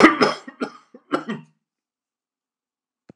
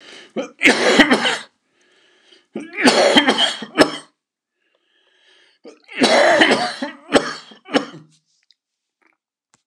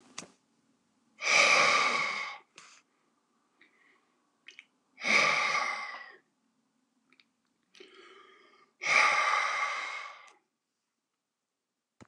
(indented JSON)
{
  "cough_length": "3.2 s",
  "cough_amplitude": 29204,
  "cough_signal_mean_std_ratio": 0.28,
  "three_cough_length": "9.7 s",
  "three_cough_amplitude": 29204,
  "three_cough_signal_mean_std_ratio": 0.43,
  "exhalation_length": "12.1 s",
  "exhalation_amplitude": 10980,
  "exhalation_signal_mean_std_ratio": 0.41,
  "survey_phase": "alpha (2021-03-01 to 2021-08-12)",
  "age": "65+",
  "gender": "Male",
  "wearing_mask": "No",
  "symptom_none": true,
  "smoker_status": "Ex-smoker",
  "respiratory_condition_asthma": false,
  "respiratory_condition_other": false,
  "recruitment_source": "REACT",
  "submission_delay": "2 days",
  "covid_test_result": "Negative",
  "covid_test_method": "RT-qPCR"
}